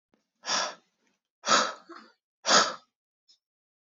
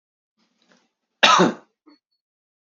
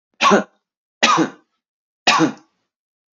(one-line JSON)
{"exhalation_length": "3.8 s", "exhalation_amplitude": 14224, "exhalation_signal_mean_std_ratio": 0.33, "cough_length": "2.7 s", "cough_amplitude": 32767, "cough_signal_mean_std_ratio": 0.26, "three_cough_length": "3.2 s", "three_cough_amplitude": 29971, "three_cough_signal_mean_std_ratio": 0.39, "survey_phase": "beta (2021-08-13 to 2022-03-07)", "age": "18-44", "gender": "Male", "wearing_mask": "No", "symptom_none": true, "smoker_status": "Never smoked", "respiratory_condition_asthma": false, "respiratory_condition_other": false, "recruitment_source": "REACT", "submission_delay": "1 day", "covid_test_result": "Negative", "covid_test_method": "RT-qPCR", "influenza_a_test_result": "Negative", "influenza_b_test_result": "Negative"}